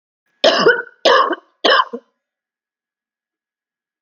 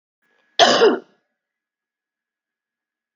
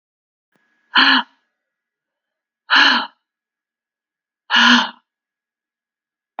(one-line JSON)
{"three_cough_length": "4.0 s", "three_cough_amplitude": 32638, "three_cough_signal_mean_std_ratio": 0.38, "cough_length": "3.2 s", "cough_amplitude": 27943, "cough_signal_mean_std_ratio": 0.28, "exhalation_length": "6.4 s", "exhalation_amplitude": 30233, "exhalation_signal_mean_std_ratio": 0.31, "survey_phase": "alpha (2021-03-01 to 2021-08-12)", "age": "45-64", "gender": "Female", "wearing_mask": "No", "symptom_fatigue": true, "symptom_headache": true, "symptom_change_to_sense_of_smell_or_taste": true, "symptom_loss_of_taste": true, "symptom_onset": "3 days", "smoker_status": "Ex-smoker", "respiratory_condition_asthma": false, "respiratory_condition_other": false, "recruitment_source": "Test and Trace", "submission_delay": "1 day", "covid_test_result": "Positive", "covid_test_method": "RT-qPCR", "covid_ct_value": 16.7, "covid_ct_gene": "ORF1ab gene", "covid_ct_mean": 17.8, "covid_viral_load": "1400000 copies/ml", "covid_viral_load_category": "High viral load (>1M copies/ml)"}